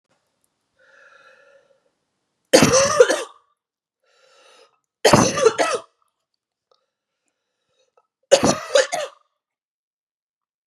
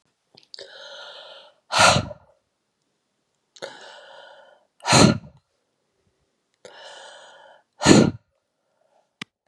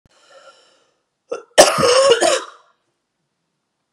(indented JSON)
{
  "three_cough_length": "10.7 s",
  "three_cough_amplitude": 32767,
  "three_cough_signal_mean_std_ratio": 0.3,
  "exhalation_length": "9.5 s",
  "exhalation_amplitude": 32767,
  "exhalation_signal_mean_std_ratio": 0.26,
  "cough_length": "3.9 s",
  "cough_amplitude": 32768,
  "cough_signal_mean_std_ratio": 0.37,
  "survey_phase": "beta (2021-08-13 to 2022-03-07)",
  "age": "45-64",
  "gender": "Female",
  "wearing_mask": "No",
  "symptom_cough_any": true,
  "symptom_runny_or_blocked_nose": true,
  "symptom_diarrhoea": true,
  "symptom_onset": "3 days",
  "smoker_status": "Never smoked",
  "respiratory_condition_asthma": true,
  "respiratory_condition_other": false,
  "recruitment_source": "Test and Trace",
  "submission_delay": "2 days",
  "covid_test_result": "Positive",
  "covid_test_method": "ePCR"
}